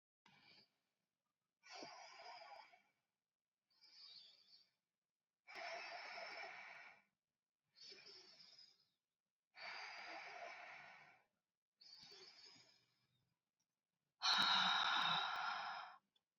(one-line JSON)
{"exhalation_length": "16.4 s", "exhalation_amplitude": 1859, "exhalation_signal_mean_std_ratio": 0.37, "survey_phase": "beta (2021-08-13 to 2022-03-07)", "age": "18-44", "gender": "Female", "wearing_mask": "No", "symptom_none": true, "smoker_status": "Never smoked", "respiratory_condition_asthma": false, "respiratory_condition_other": false, "recruitment_source": "REACT", "submission_delay": "2 days", "covid_test_result": "Negative", "covid_test_method": "RT-qPCR", "influenza_a_test_result": "Negative", "influenza_b_test_result": "Negative"}